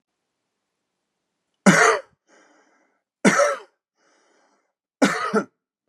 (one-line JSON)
{"three_cough_length": "5.9 s", "three_cough_amplitude": 29547, "three_cough_signal_mean_std_ratio": 0.31, "survey_phase": "beta (2021-08-13 to 2022-03-07)", "age": "45-64", "gender": "Male", "wearing_mask": "No", "symptom_none": true, "smoker_status": "Ex-smoker", "respiratory_condition_asthma": false, "respiratory_condition_other": false, "recruitment_source": "REACT", "submission_delay": "1 day", "covid_test_result": "Negative", "covid_test_method": "RT-qPCR", "influenza_a_test_result": "Negative", "influenza_b_test_result": "Negative"}